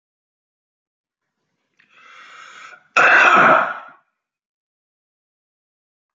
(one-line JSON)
{"cough_length": "6.1 s", "cough_amplitude": 30789, "cough_signal_mean_std_ratio": 0.3, "survey_phase": "alpha (2021-03-01 to 2021-08-12)", "age": "45-64", "gender": "Male", "wearing_mask": "No", "symptom_cough_any": true, "smoker_status": "Ex-smoker", "respiratory_condition_asthma": false, "respiratory_condition_other": false, "recruitment_source": "REACT", "submission_delay": "4 days", "covid_test_result": "Negative", "covid_test_method": "RT-qPCR"}